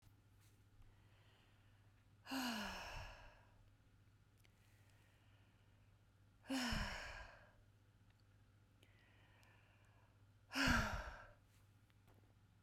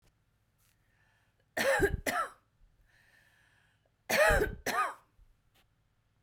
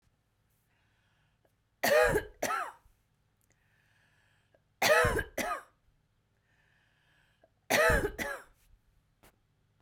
{"exhalation_length": "12.6 s", "exhalation_amplitude": 2165, "exhalation_signal_mean_std_ratio": 0.38, "cough_length": "6.2 s", "cough_amplitude": 7076, "cough_signal_mean_std_ratio": 0.37, "three_cough_length": "9.8 s", "three_cough_amplitude": 7780, "three_cough_signal_mean_std_ratio": 0.34, "survey_phase": "beta (2021-08-13 to 2022-03-07)", "age": "45-64", "gender": "Female", "wearing_mask": "No", "symptom_fatigue": true, "symptom_headache": true, "smoker_status": "Never smoked", "respiratory_condition_asthma": false, "respiratory_condition_other": false, "recruitment_source": "REACT", "submission_delay": "0 days", "covid_test_result": "Negative", "covid_test_method": "RT-qPCR", "influenza_a_test_result": "Negative", "influenza_b_test_result": "Negative"}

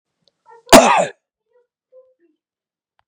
{"cough_length": "3.1 s", "cough_amplitude": 32768, "cough_signal_mean_std_ratio": 0.25, "survey_phase": "beta (2021-08-13 to 2022-03-07)", "age": "18-44", "gender": "Male", "wearing_mask": "No", "symptom_none": true, "smoker_status": "Ex-smoker", "respiratory_condition_asthma": false, "respiratory_condition_other": false, "recruitment_source": "REACT", "submission_delay": "1 day", "covid_test_result": "Negative", "covid_test_method": "RT-qPCR", "influenza_a_test_result": "Negative", "influenza_b_test_result": "Negative"}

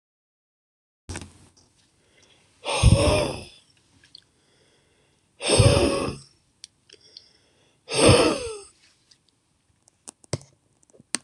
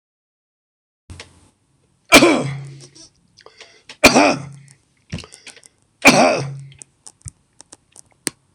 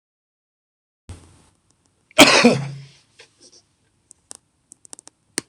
{"exhalation_length": "11.2 s", "exhalation_amplitude": 25362, "exhalation_signal_mean_std_ratio": 0.33, "three_cough_length": "8.5 s", "three_cough_amplitude": 26028, "three_cough_signal_mean_std_ratio": 0.3, "cough_length": "5.5 s", "cough_amplitude": 26028, "cough_signal_mean_std_ratio": 0.23, "survey_phase": "beta (2021-08-13 to 2022-03-07)", "age": "65+", "gender": "Male", "wearing_mask": "No", "symptom_none": true, "smoker_status": "Never smoked", "respiratory_condition_asthma": false, "respiratory_condition_other": false, "recruitment_source": "REACT", "submission_delay": "1 day", "covid_test_result": "Negative", "covid_test_method": "RT-qPCR"}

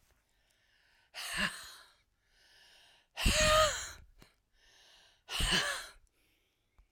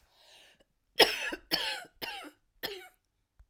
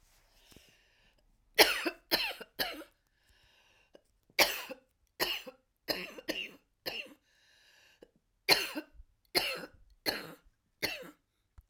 {"exhalation_length": "6.9 s", "exhalation_amplitude": 6227, "exhalation_signal_mean_std_ratio": 0.38, "cough_length": "3.5 s", "cough_amplitude": 15084, "cough_signal_mean_std_ratio": 0.31, "three_cough_length": "11.7 s", "three_cough_amplitude": 20344, "three_cough_signal_mean_std_ratio": 0.31, "survey_phase": "alpha (2021-03-01 to 2021-08-12)", "age": "65+", "gender": "Female", "wearing_mask": "No", "symptom_none": true, "smoker_status": "Never smoked", "respiratory_condition_asthma": true, "respiratory_condition_other": false, "recruitment_source": "REACT", "submission_delay": "3 days", "covid_test_result": "Negative", "covid_test_method": "RT-qPCR"}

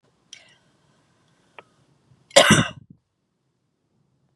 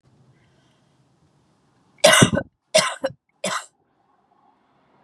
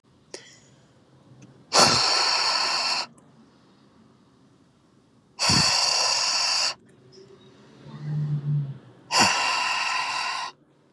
{"cough_length": "4.4 s", "cough_amplitude": 32767, "cough_signal_mean_std_ratio": 0.2, "three_cough_length": "5.0 s", "three_cough_amplitude": 32768, "three_cough_signal_mean_std_ratio": 0.27, "exhalation_length": "10.9 s", "exhalation_amplitude": 25812, "exhalation_signal_mean_std_ratio": 0.59, "survey_phase": "beta (2021-08-13 to 2022-03-07)", "age": "18-44", "gender": "Female", "wearing_mask": "No", "symptom_none": true, "smoker_status": "Ex-smoker", "respiratory_condition_asthma": false, "respiratory_condition_other": false, "recruitment_source": "REACT", "submission_delay": "2 days", "covid_test_result": "Negative", "covid_test_method": "RT-qPCR", "influenza_a_test_result": "Negative", "influenza_b_test_result": "Negative"}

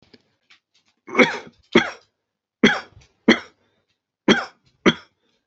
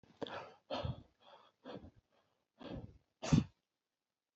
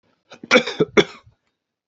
{"three_cough_length": "5.5 s", "three_cough_amplitude": 30453, "three_cough_signal_mean_std_ratio": 0.28, "exhalation_length": "4.4 s", "exhalation_amplitude": 4275, "exhalation_signal_mean_std_ratio": 0.29, "cough_length": "1.9 s", "cough_amplitude": 28600, "cough_signal_mean_std_ratio": 0.3, "survey_phase": "alpha (2021-03-01 to 2021-08-12)", "age": "45-64", "gender": "Male", "wearing_mask": "No", "symptom_fatigue": true, "symptom_onset": "13 days", "smoker_status": "Never smoked", "respiratory_condition_asthma": false, "respiratory_condition_other": false, "recruitment_source": "REACT", "submission_delay": "1 day", "covid_test_result": "Negative", "covid_test_method": "RT-qPCR"}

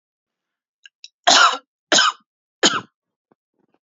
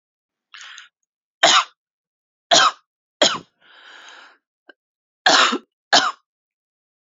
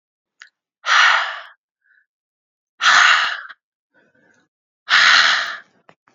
{"cough_length": "3.8 s", "cough_amplitude": 30489, "cough_signal_mean_std_ratio": 0.32, "three_cough_length": "7.2 s", "three_cough_amplitude": 32768, "three_cough_signal_mean_std_ratio": 0.31, "exhalation_length": "6.1 s", "exhalation_amplitude": 30873, "exhalation_signal_mean_std_ratio": 0.42, "survey_phase": "beta (2021-08-13 to 2022-03-07)", "age": "18-44", "gender": "Female", "wearing_mask": "No", "symptom_runny_or_blocked_nose": true, "symptom_onset": "8 days", "smoker_status": "Current smoker (e-cigarettes or vapes only)", "respiratory_condition_asthma": false, "respiratory_condition_other": false, "recruitment_source": "REACT", "submission_delay": "3 days", "covid_test_result": "Negative", "covid_test_method": "RT-qPCR", "influenza_a_test_result": "Negative", "influenza_b_test_result": "Negative"}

